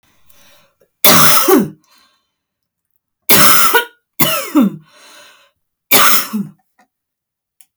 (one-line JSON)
{"three_cough_length": "7.8 s", "three_cough_amplitude": 32768, "three_cough_signal_mean_std_ratio": 0.43, "survey_phase": "beta (2021-08-13 to 2022-03-07)", "age": "45-64", "gender": "Female", "wearing_mask": "No", "symptom_none": true, "smoker_status": "Never smoked", "respiratory_condition_asthma": false, "respiratory_condition_other": false, "recruitment_source": "REACT", "submission_delay": "2 days", "covid_test_result": "Negative", "covid_test_method": "RT-qPCR"}